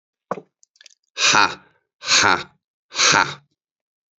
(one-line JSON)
{"exhalation_length": "4.2 s", "exhalation_amplitude": 29271, "exhalation_signal_mean_std_ratio": 0.38, "survey_phase": "beta (2021-08-13 to 2022-03-07)", "age": "18-44", "gender": "Male", "wearing_mask": "No", "symptom_none": true, "smoker_status": "Never smoked", "respiratory_condition_asthma": false, "respiratory_condition_other": false, "recruitment_source": "REACT", "submission_delay": "1 day", "covid_test_result": "Negative", "covid_test_method": "RT-qPCR", "influenza_a_test_result": "Negative", "influenza_b_test_result": "Negative"}